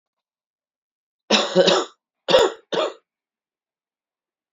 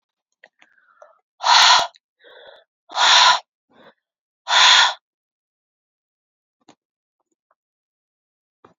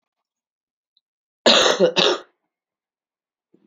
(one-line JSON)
{"three_cough_length": "4.5 s", "three_cough_amplitude": 26085, "three_cough_signal_mean_std_ratio": 0.34, "exhalation_length": "8.8 s", "exhalation_amplitude": 30489, "exhalation_signal_mean_std_ratio": 0.31, "cough_length": "3.7 s", "cough_amplitude": 32768, "cough_signal_mean_std_ratio": 0.33, "survey_phase": "beta (2021-08-13 to 2022-03-07)", "age": "45-64", "gender": "Female", "wearing_mask": "No", "symptom_cough_any": true, "symptom_runny_or_blocked_nose": true, "symptom_sore_throat": true, "symptom_fatigue": true, "symptom_fever_high_temperature": true, "symptom_headache": true, "symptom_change_to_sense_of_smell_or_taste": true, "symptom_onset": "4 days", "smoker_status": "Never smoked", "respiratory_condition_asthma": false, "respiratory_condition_other": false, "recruitment_source": "Test and Trace", "submission_delay": "2 days", "covid_test_result": "Positive", "covid_test_method": "RT-qPCR"}